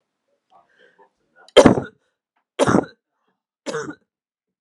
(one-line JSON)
{"three_cough_length": "4.6 s", "three_cough_amplitude": 32768, "three_cough_signal_mean_std_ratio": 0.24, "survey_phase": "alpha (2021-03-01 to 2021-08-12)", "age": "18-44", "gender": "Female", "wearing_mask": "No", "symptom_shortness_of_breath": true, "symptom_diarrhoea": true, "symptom_fatigue": true, "symptom_headache": true, "smoker_status": "Never smoked", "respiratory_condition_asthma": false, "respiratory_condition_other": false, "recruitment_source": "Test and Trace", "submission_delay": "1 day", "covid_test_result": "Positive", "covid_test_method": "ePCR"}